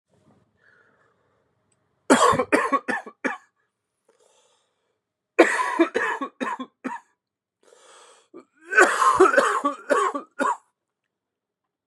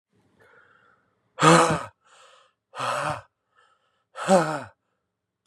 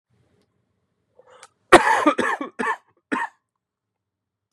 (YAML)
three_cough_length: 11.9 s
three_cough_amplitude: 29763
three_cough_signal_mean_std_ratio: 0.38
exhalation_length: 5.5 s
exhalation_amplitude: 27488
exhalation_signal_mean_std_ratio: 0.32
cough_length: 4.5 s
cough_amplitude: 32768
cough_signal_mean_std_ratio: 0.29
survey_phase: beta (2021-08-13 to 2022-03-07)
age: 45-64
gender: Male
wearing_mask: 'No'
symptom_new_continuous_cough: true
symptom_runny_or_blocked_nose: true
symptom_fever_high_temperature: true
symptom_change_to_sense_of_smell_or_taste: true
symptom_onset: 6 days
smoker_status: Never smoked
respiratory_condition_asthma: false
respiratory_condition_other: false
recruitment_source: Test and Trace
submission_delay: 4 days
covid_test_result: Positive
covid_test_method: RT-qPCR
covid_ct_value: 14.9
covid_ct_gene: S gene